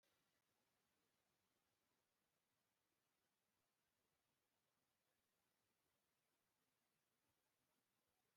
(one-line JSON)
{"three_cough_length": "8.4 s", "three_cough_amplitude": 6, "three_cough_signal_mean_std_ratio": 0.77, "survey_phase": "beta (2021-08-13 to 2022-03-07)", "age": "65+", "gender": "Male", "wearing_mask": "No", "symptom_none": true, "symptom_onset": "12 days", "smoker_status": "Never smoked", "respiratory_condition_asthma": false, "respiratory_condition_other": false, "recruitment_source": "REACT", "submission_delay": "1 day", "covid_test_result": "Negative", "covid_test_method": "RT-qPCR"}